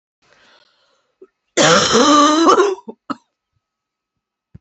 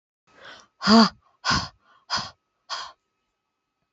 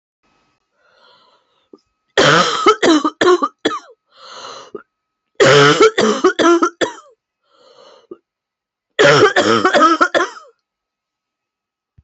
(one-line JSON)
{"cough_length": "4.6 s", "cough_amplitude": 32002, "cough_signal_mean_std_ratio": 0.44, "exhalation_length": "3.9 s", "exhalation_amplitude": 21739, "exhalation_signal_mean_std_ratio": 0.3, "three_cough_length": "12.0 s", "three_cough_amplitude": 32349, "three_cough_signal_mean_std_ratio": 0.46, "survey_phase": "beta (2021-08-13 to 2022-03-07)", "age": "45-64", "gender": "Female", "wearing_mask": "No", "symptom_cough_any": true, "symptom_runny_or_blocked_nose": true, "symptom_shortness_of_breath": true, "symptom_fatigue": true, "symptom_headache": true, "symptom_change_to_sense_of_smell_or_taste": true, "symptom_onset": "4 days", "smoker_status": "Never smoked", "respiratory_condition_asthma": false, "respiratory_condition_other": false, "recruitment_source": "Test and Trace", "submission_delay": "2 days", "covid_test_result": "Positive", "covid_test_method": "RT-qPCR", "covid_ct_value": 25.5, "covid_ct_gene": "ORF1ab gene", "covid_ct_mean": 26.6, "covid_viral_load": "1900 copies/ml", "covid_viral_load_category": "Minimal viral load (< 10K copies/ml)"}